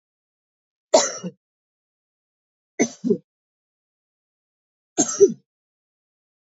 {"three_cough_length": "6.5 s", "three_cough_amplitude": 25754, "three_cough_signal_mean_std_ratio": 0.23, "survey_phase": "alpha (2021-03-01 to 2021-08-12)", "age": "18-44", "gender": "Female", "wearing_mask": "No", "symptom_none": true, "smoker_status": "Never smoked", "respiratory_condition_asthma": false, "respiratory_condition_other": false, "recruitment_source": "REACT", "submission_delay": "2 days", "covid_test_result": "Negative", "covid_test_method": "RT-qPCR"}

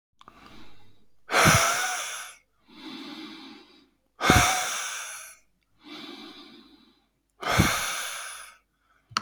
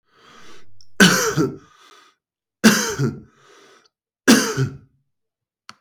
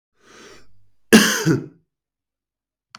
{"exhalation_length": "9.2 s", "exhalation_amplitude": 21530, "exhalation_signal_mean_std_ratio": 0.43, "three_cough_length": "5.8 s", "three_cough_amplitude": 32768, "three_cough_signal_mean_std_ratio": 0.38, "cough_length": "3.0 s", "cough_amplitude": 32768, "cough_signal_mean_std_ratio": 0.3, "survey_phase": "beta (2021-08-13 to 2022-03-07)", "age": "18-44", "gender": "Male", "wearing_mask": "No", "symptom_cough_any": true, "symptom_shortness_of_breath": true, "symptom_sore_throat": true, "symptom_other": true, "symptom_onset": "5 days", "smoker_status": "Ex-smoker", "respiratory_condition_asthma": false, "respiratory_condition_other": false, "recruitment_source": "REACT", "submission_delay": "0 days", "covid_test_result": "Negative", "covid_test_method": "RT-qPCR"}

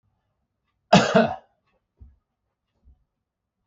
{"cough_length": "3.7 s", "cough_amplitude": 26320, "cough_signal_mean_std_ratio": 0.24, "survey_phase": "beta (2021-08-13 to 2022-03-07)", "age": "45-64", "gender": "Male", "wearing_mask": "No", "symptom_none": true, "smoker_status": "Never smoked", "respiratory_condition_asthma": false, "respiratory_condition_other": false, "recruitment_source": "REACT", "submission_delay": "0 days", "covid_test_result": "Negative", "covid_test_method": "RT-qPCR"}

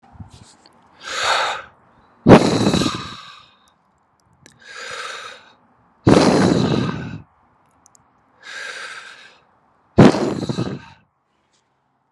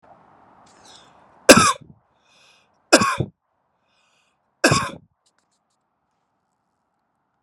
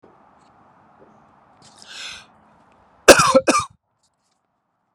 {"exhalation_length": "12.1 s", "exhalation_amplitude": 32768, "exhalation_signal_mean_std_ratio": 0.36, "three_cough_length": "7.4 s", "three_cough_amplitude": 32768, "three_cough_signal_mean_std_ratio": 0.22, "cough_length": "4.9 s", "cough_amplitude": 32768, "cough_signal_mean_std_ratio": 0.23, "survey_phase": "beta (2021-08-13 to 2022-03-07)", "age": "45-64", "gender": "Male", "wearing_mask": "No", "symptom_none": true, "smoker_status": "Never smoked", "respiratory_condition_asthma": false, "respiratory_condition_other": false, "recruitment_source": "REACT", "submission_delay": "2 days", "covid_test_result": "Negative", "covid_test_method": "RT-qPCR"}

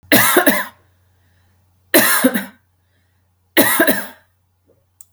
{"three_cough_length": "5.1 s", "three_cough_amplitude": 32768, "three_cough_signal_mean_std_ratio": 0.43, "survey_phase": "beta (2021-08-13 to 2022-03-07)", "age": "45-64", "gender": "Female", "wearing_mask": "No", "symptom_none": true, "smoker_status": "Never smoked", "respiratory_condition_asthma": false, "respiratory_condition_other": false, "recruitment_source": "REACT", "submission_delay": "2 days", "covid_test_result": "Negative", "covid_test_method": "RT-qPCR", "influenza_a_test_result": "Negative", "influenza_b_test_result": "Negative"}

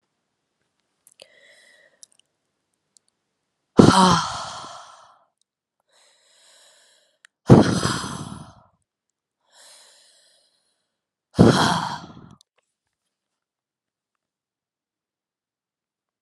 {"exhalation_length": "16.2 s", "exhalation_amplitude": 32768, "exhalation_signal_mean_std_ratio": 0.23, "survey_phase": "alpha (2021-03-01 to 2021-08-12)", "age": "45-64", "gender": "Female", "wearing_mask": "No", "symptom_cough_any": true, "symptom_shortness_of_breath": true, "symptom_fatigue": true, "symptom_fever_high_temperature": true, "symptom_headache": true, "symptom_change_to_sense_of_smell_or_taste": true, "symptom_loss_of_taste": true, "smoker_status": "Never smoked", "respiratory_condition_asthma": true, "respiratory_condition_other": false, "recruitment_source": "Test and Trace", "submission_delay": "1 day", "covid_test_result": "Positive", "covid_test_method": "RT-qPCR"}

